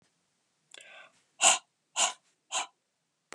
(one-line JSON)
{"exhalation_length": "3.3 s", "exhalation_amplitude": 14542, "exhalation_signal_mean_std_ratio": 0.27, "survey_phase": "beta (2021-08-13 to 2022-03-07)", "age": "18-44", "gender": "Male", "wearing_mask": "No", "symptom_cough_any": true, "symptom_fatigue": true, "smoker_status": "Current smoker (e-cigarettes or vapes only)", "respiratory_condition_asthma": false, "respiratory_condition_other": false, "recruitment_source": "Test and Trace", "submission_delay": "1 day", "covid_test_result": "Negative", "covid_test_method": "RT-qPCR"}